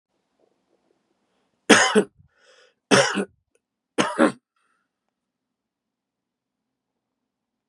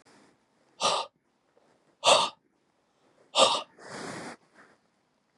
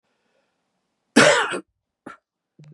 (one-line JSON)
{"three_cough_length": "7.7 s", "three_cough_amplitude": 32547, "three_cough_signal_mean_std_ratio": 0.24, "exhalation_length": "5.4 s", "exhalation_amplitude": 17418, "exhalation_signal_mean_std_ratio": 0.31, "cough_length": "2.7 s", "cough_amplitude": 30499, "cough_signal_mean_std_ratio": 0.29, "survey_phase": "beta (2021-08-13 to 2022-03-07)", "age": "45-64", "gender": "Male", "wearing_mask": "No", "symptom_cough_any": true, "symptom_other": true, "smoker_status": "Current smoker (e-cigarettes or vapes only)", "respiratory_condition_asthma": false, "respiratory_condition_other": false, "recruitment_source": "Test and Trace", "submission_delay": "1 day", "covid_test_result": "Positive", "covid_test_method": "RT-qPCR", "covid_ct_value": 12.3, "covid_ct_gene": "ORF1ab gene"}